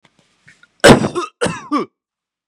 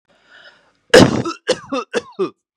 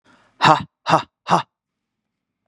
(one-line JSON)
{"cough_length": "2.5 s", "cough_amplitude": 32768, "cough_signal_mean_std_ratio": 0.34, "three_cough_length": "2.6 s", "three_cough_amplitude": 32768, "three_cough_signal_mean_std_ratio": 0.35, "exhalation_length": "2.5 s", "exhalation_amplitude": 32768, "exhalation_signal_mean_std_ratio": 0.3, "survey_phase": "beta (2021-08-13 to 2022-03-07)", "age": "18-44", "gender": "Male", "wearing_mask": "No", "symptom_sore_throat": true, "smoker_status": "Current smoker (1 to 10 cigarettes per day)", "respiratory_condition_asthma": false, "respiratory_condition_other": false, "recruitment_source": "REACT", "submission_delay": "0 days", "covid_test_result": "Negative", "covid_test_method": "RT-qPCR"}